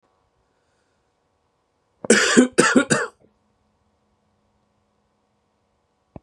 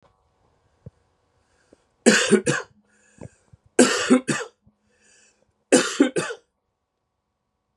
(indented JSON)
{
  "cough_length": "6.2 s",
  "cough_amplitude": 32767,
  "cough_signal_mean_std_ratio": 0.27,
  "three_cough_length": "7.8 s",
  "three_cough_amplitude": 31627,
  "three_cough_signal_mean_std_ratio": 0.31,
  "survey_phase": "beta (2021-08-13 to 2022-03-07)",
  "age": "18-44",
  "gender": "Male",
  "wearing_mask": "No",
  "symptom_cough_any": true,
  "symptom_runny_or_blocked_nose": true,
  "symptom_shortness_of_breath": true,
  "symptom_abdominal_pain": true,
  "symptom_fatigue": true,
  "symptom_fever_high_temperature": true,
  "symptom_headache": true,
  "symptom_change_to_sense_of_smell_or_taste": true,
  "symptom_loss_of_taste": true,
  "smoker_status": "Never smoked",
  "respiratory_condition_asthma": false,
  "respiratory_condition_other": false,
  "recruitment_source": "Test and Trace",
  "submission_delay": "1 day",
  "covid_test_result": "Positive",
  "covid_test_method": "RT-qPCR"
}